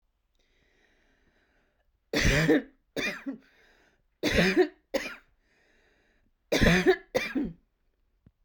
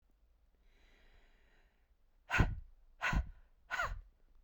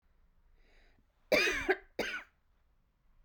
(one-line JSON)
{"three_cough_length": "8.4 s", "three_cough_amplitude": 12608, "three_cough_signal_mean_std_ratio": 0.39, "exhalation_length": "4.4 s", "exhalation_amplitude": 5483, "exhalation_signal_mean_std_ratio": 0.35, "cough_length": "3.2 s", "cough_amplitude": 5399, "cough_signal_mean_std_ratio": 0.34, "survey_phase": "beta (2021-08-13 to 2022-03-07)", "age": "45-64", "gender": "Female", "wearing_mask": "No", "symptom_cough_any": true, "smoker_status": "Never smoked", "respiratory_condition_asthma": false, "respiratory_condition_other": false, "recruitment_source": "Test and Trace", "submission_delay": "0 days", "covid_test_result": "Positive", "covid_test_method": "RT-qPCR"}